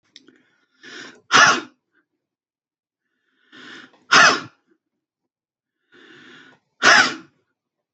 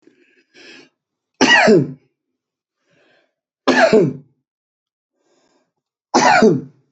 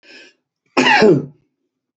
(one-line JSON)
{"exhalation_length": "7.9 s", "exhalation_amplitude": 31324, "exhalation_signal_mean_std_ratio": 0.27, "three_cough_length": "6.9 s", "three_cough_amplitude": 29267, "three_cough_signal_mean_std_ratio": 0.37, "cough_length": "2.0 s", "cough_amplitude": 28446, "cough_signal_mean_std_ratio": 0.42, "survey_phase": "beta (2021-08-13 to 2022-03-07)", "age": "45-64", "gender": "Male", "wearing_mask": "No", "symptom_none": true, "smoker_status": "Never smoked", "respiratory_condition_asthma": true, "respiratory_condition_other": false, "recruitment_source": "REACT", "submission_delay": "1 day", "covid_test_result": "Negative", "covid_test_method": "RT-qPCR"}